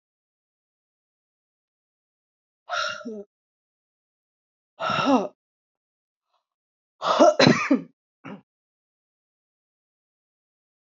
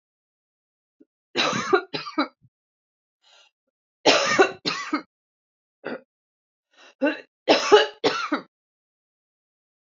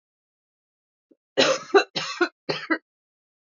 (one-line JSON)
{"exhalation_length": "10.8 s", "exhalation_amplitude": 25441, "exhalation_signal_mean_std_ratio": 0.26, "three_cough_length": "10.0 s", "three_cough_amplitude": 25368, "three_cough_signal_mean_std_ratio": 0.33, "cough_length": "3.6 s", "cough_amplitude": 23007, "cough_signal_mean_std_ratio": 0.32, "survey_phase": "beta (2021-08-13 to 2022-03-07)", "age": "45-64", "gender": "Female", "wearing_mask": "No", "symptom_cough_any": true, "symptom_runny_or_blocked_nose": true, "symptom_shortness_of_breath": true, "symptom_sore_throat": true, "symptom_fatigue": true, "symptom_fever_high_temperature": true, "symptom_headache": true, "symptom_other": true, "symptom_onset": "3 days", "smoker_status": "Ex-smoker", "respiratory_condition_asthma": true, "respiratory_condition_other": false, "recruitment_source": "Test and Trace", "submission_delay": "2 days", "covid_test_result": "Positive", "covid_test_method": "RT-qPCR", "covid_ct_value": 18.6, "covid_ct_gene": "ORF1ab gene", "covid_ct_mean": 18.9, "covid_viral_load": "650000 copies/ml", "covid_viral_load_category": "Low viral load (10K-1M copies/ml)"}